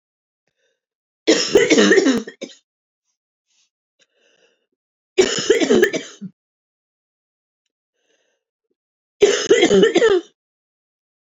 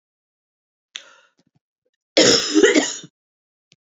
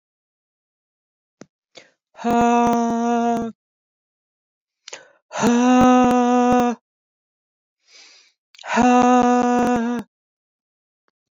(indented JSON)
{
  "three_cough_length": "11.3 s",
  "three_cough_amplitude": 28649,
  "three_cough_signal_mean_std_ratio": 0.38,
  "cough_length": "3.8 s",
  "cough_amplitude": 29187,
  "cough_signal_mean_std_ratio": 0.34,
  "exhalation_length": "11.3 s",
  "exhalation_amplitude": 21668,
  "exhalation_signal_mean_std_ratio": 0.52,
  "survey_phase": "beta (2021-08-13 to 2022-03-07)",
  "age": "45-64",
  "gender": "Female",
  "wearing_mask": "No",
  "symptom_runny_or_blocked_nose": true,
  "symptom_shortness_of_breath": true,
  "symptom_fatigue": true,
  "symptom_onset": "12 days",
  "smoker_status": "Current smoker (1 to 10 cigarettes per day)",
  "respiratory_condition_asthma": true,
  "respiratory_condition_other": false,
  "recruitment_source": "REACT",
  "submission_delay": "2 days",
  "covid_test_result": "Negative",
  "covid_test_method": "RT-qPCR",
  "influenza_a_test_result": "Unknown/Void",
  "influenza_b_test_result": "Unknown/Void"
}